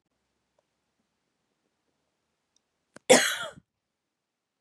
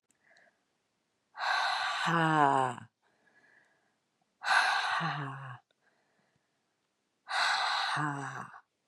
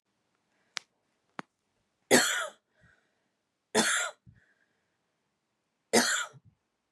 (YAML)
cough_length: 4.6 s
cough_amplitude: 20615
cough_signal_mean_std_ratio: 0.17
exhalation_length: 8.9 s
exhalation_amplitude: 8696
exhalation_signal_mean_std_ratio: 0.49
three_cough_length: 6.9 s
three_cough_amplitude: 17685
three_cough_signal_mean_std_ratio: 0.29
survey_phase: beta (2021-08-13 to 2022-03-07)
age: 45-64
gender: Female
wearing_mask: 'No'
symptom_cough_any: true
symptom_runny_or_blocked_nose: true
symptom_sore_throat: true
symptom_headache: true
smoker_status: Never smoked
respiratory_condition_asthma: false
respiratory_condition_other: false
recruitment_source: Test and Trace
submission_delay: 1 day
covid_test_result: Positive
covid_test_method: ePCR